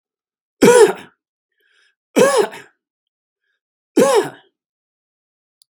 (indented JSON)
{
  "three_cough_length": "5.8 s",
  "three_cough_amplitude": 32767,
  "three_cough_signal_mean_std_ratio": 0.32,
  "survey_phase": "beta (2021-08-13 to 2022-03-07)",
  "age": "65+",
  "gender": "Male",
  "wearing_mask": "No",
  "symptom_none": true,
  "smoker_status": "Never smoked",
  "respiratory_condition_asthma": false,
  "respiratory_condition_other": false,
  "recruitment_source": "REACT",
  "submission_delay": "2 days",
  "covid_test_result": "Negative",
  "covid_test_method": "RT-qPCR",
  "influenza_a_test_result": "Negative",
  "influenza_b_test_result": "Negative"
}